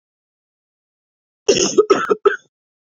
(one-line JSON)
{"cough_length": "2.8 s", "cough_amplitude": 27845, "cough_signal_mean_std_ratio": 0.35, "survey_phase": "beta (2021-08-13 to 2022-03-07)", "age": "18-44", "gender": "Female", "wearing_mask": "No", "symptom_cough_any": true, "symptom_runny_or_blocked_nose": true, "symptom_sore_throat": true, "symptom_fatigue": true, "symptom_fever_high_temperature": true, "symptom_headache": true, "symptom_change_to_sense_of_smell_or_taste": true, "symptom_loss_of_taste": true, "symptom_other": true, "symptom_onset": "6 days", "smoker_status": "Never smoked", "respiratory_condition_asthma": false, "respiratory_condition_other": false, "recruitment_source": "Test and Trace", "submission_delay": "4 days", "covid_test_result": "Positive", "covid_test_method": "RT-qPCR", "covid_ct_value": 18.6, "covid_ct_gene": "N gene"}